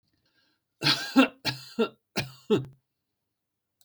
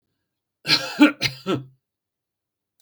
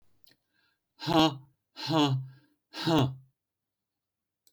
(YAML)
three_cough_length: 3.8 s
three_cough_amplitude: 14042
three_cough_signal_mean_std_ratio: 0.34
cough_length: 2.8 s
cough_amplitude: 29289
cough_signal_mean_std_ratio: 0.31
exhalation_length: 4.5 s
exhalation_amplitude: 11162
exhalation_signal_mean_std_ratio: 0.39
survey_phase: beta (2021-08-13 to 2022-03-07)
age: 65+
gender: Male
wearing_mask: 'No'
symptom_none: true
symptom_onset: 12 days
smoker_status: Never smoked
respiratory_condition_asthma: false
respiratory_condition_other: false
recruitment_source: REACT
submission_delay: 1 day
covid_test_result: Negative
covid_test_method: RT-qPCR
influenza_a_test_result: Negative
influenza_b_test_result: Negative